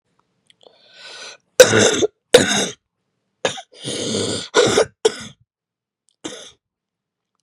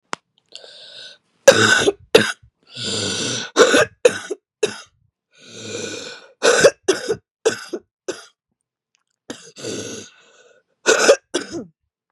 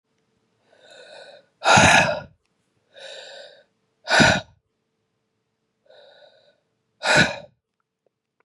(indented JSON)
{
  "cough_length": "7.4 s",
  "cough_amplitude": 32768,
  "cough_signal_mean_std_ratio": 0.35,
  "three_cough_length": "12.1 s",
  "three_cough_amplitude": 32768,
  "three_cough_signal_mean_std_ratio": 0.37,
  "exhalation_length": "8.4 s",
  "exhalation_amplitude": 29469,
  "exhalation_signal_mean_std_ratio": 0.3,
  "survey_phase": "beta (2021-08-13 to 2022-03-07)",
  "age": "45-64",
  "gender": "Female",
  "wearing_mask": "No",
  "symptom_new_continuous_cough": true,
  "symptom_runny_or_blocked_nose": true,
  "symptom_shortness_of_breath": true,
  "symptom_sore_throat": true,
  "symptom_fatigue": true,
  "symptom_fever_high_temperature": true,
  "symptom_headache": true,
  "symptom_other": true,
  "symptom_onset": "3 days",
  "smoker_status": "Never smoked",
  "respiratory_condition_asthma": false,
  "respiratory_condition_other": false,
  "recruitment_source": "Test and Trace",
  "submission_delay": "2 days",
  "covid_test_result": "Positive",
  "covid_test_method": "ePCR"
}